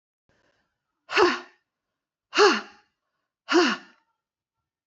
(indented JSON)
{
  "exhalation_length": "4.9 s",
  "exhalation_amplitude": 19747,
  "exhalation_signal_mean_std_ratio": 0.31,
  "survey_phase": "beta (2021-08-13 to 2022-03-07)",
  "age": "45-64",
  "gender": "Female",
  "wearing_mask": "No",
  "symptom_cough_any": true,
  "symptom_runny_or_blocked_nose": true,
  "symptom_fatigue": true,
  "symptom_headache": true,
  "symptom_other": true,
  "symptom_onset": "5 days",
  "smoker_status": "Never smoked",
  "respiratory_condition_asthma": false,
  "respiratory_condition_other": false,
  "recruitment_source": "Test and Trace",
  "submission_delay": "1 day",
  "covid_test_result": "Positive",
  "covid_test_method": "RT-qPCR",
  "covid_ct_value": 22.0,
  "covid_ct_gene": "ORF1ab gene"
}